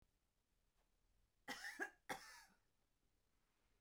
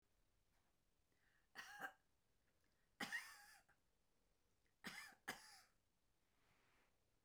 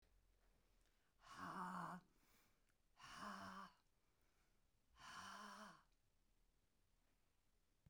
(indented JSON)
{
  "cough_length": "3.8 s",
  "cough_amplitude": 668,
  "cough_signal_mean_std_ratio": 0.34,
  "three_cough_length": "7.2 s",
  "three_cough_amplitude": 530,
  "three_cough_signal_mean_std_ratio": 0.35,
  "exhalation_length": "7.9 s",
  "exhalation_amplitude": 376,
  "exhalation_signal_mean_std_ratio": 0.49,
  "survey_phase": "beta (2021-08-13 to 2022-03-07)",
  "age": "65+",
  "gender": "Female",
  "wearing_mask": "No",
  "symptom_none": true,
  "smoker_status": "Never smoked",
  "respiratory_condition_asthma": false,
  "respiratory_condition_other": false,
  "recruitment_source": "REACT",
  "submission_delay": "1 day",
  "covid_test_result": "Negative",
  "covid_test_method": "RT-qPCR"
}